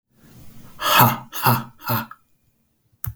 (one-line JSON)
{"exhalation_length": "3.2 s", "exhalation_amplitude": 32768, "exhalation_signal_mean_std_ratio": 0.41, "survey_phase": "beta (2021-08-13 to 2022-03-07)", "age": "45-64", "gender": "Male", "wearing_mask": "No", "symptom_fatigue": true, "symptom_onset": "12 days", "smoker_status": "Ex-smoker", "respiratory_condition_asthma": false, "respiratory_condition_other": false, "recruitment_source": "REACT", "submission_delay": "1 day", "covid_test_result": "Negative", "covid_test_method": "RT-qPCR"}